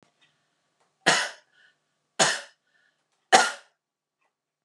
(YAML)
three_cough_length: 4.6 s
three_cough_amplitude: 30439
three_cough_signal_mean_std_ratio: 0.26
survey_phase: beta (2021-08-13 to 2022-03-07)
age: 45-64
gender: Female
wearing_mask: 'No'
symptom_none: true
smoker_status: Ex-smoker
respiratory_condition_asthma: false
respiratory_condition_other: false
recruitment_source: REACT
submission_delay: 2 days
covid_test_result: Negative
covid_test_method: RT-qPCR